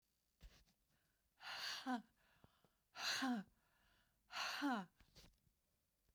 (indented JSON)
{
  "exhalation_length": "6.1 s",
  "exhalation_amplitude": 945,
  "exhalation_signal_mean_std_ratio": 0.42,
  "survey_phase": "beta (2021-08-13 to 2022-03-07)",
  "age": "65+",
  "gender": "Female",
  "wearing_mask": "No",
  "symptom_none": true,
  "smoker_status": "Ex-smoker",
  "respiratory_condition_asthma": false,
  "respiratory_condition_other": false,
  "recruitment_source": "REACT",
  "submission_delay": "1 day",
  "covid_test_result": "Negative",
  "covid_test_method": "RT-qPCR"
}